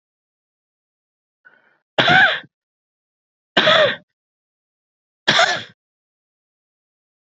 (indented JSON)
{
  "three_cough_length": "7.3 s",
  "three_cough_amplitude": 29711,
  "three_cough_signal_mean_std_ratio": 0.3,
  "survey_phase": "beta (2021-08-13 to 2022-03-07)",
  "age": "45-64",
  "gender": "Male",
  "wearing_mask": "No",
  "symptom_cough_any": true,
  "symptom_runny_or_blocked_nose": true,
  "symptom_sore_throat": true,
  "symptom_fatigue": true,
  "symptom_change_to_sense_of_smell_or_taste": true,
  "symptom_loss_of_taste": true,
  "symptom_other": true,
  "symptom_onset": "3 days",
  "smoker_status": "Ex-smoker",
  "respiratory_condition_asthma": false,
  "respiratory_condition_other": false,
  "recruitment_source": "Test and Trace",
  "submission_delay": "1 day",
  "covid_test_result": "Positive",
  "covid_test_method": "RT-qPCR",
  "covid_ct_value": 23.5,
  "covid_ct_gene": "ORF1ab gene"
}